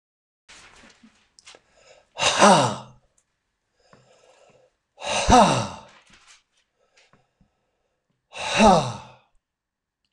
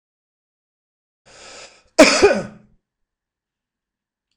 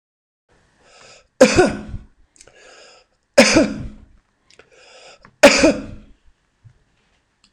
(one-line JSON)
{"exhalation_length": "10.1 s", "exhalation_amplitude": 25798, "exhalation_signal_mean_std_ratio": 0.3, "cough_length": "4.4 s", "cough_amplitude": 26028, "cough_signal_mean_std_ratio": 0.23, "three_cough_length": "7.5 s", "three_cough_amplitude": 26028, "three_cough_signal_mean_std_ratio": 0.3, "survey_phase": "beta (2021-08-13 to 2022-03-07)", "age": "65+", "gender": "Male", "wearing_mask": "No", "symptom_none": true, "smoker_status": "Never smoked", "respiratory_condition_asthma": false, "respiratory_condition_other": false, "recruitment_source": "Test and Trace", "submission_delay": "1 day", "covid_test_result": "Negative", "covid_test_method": "RT-qPCR"}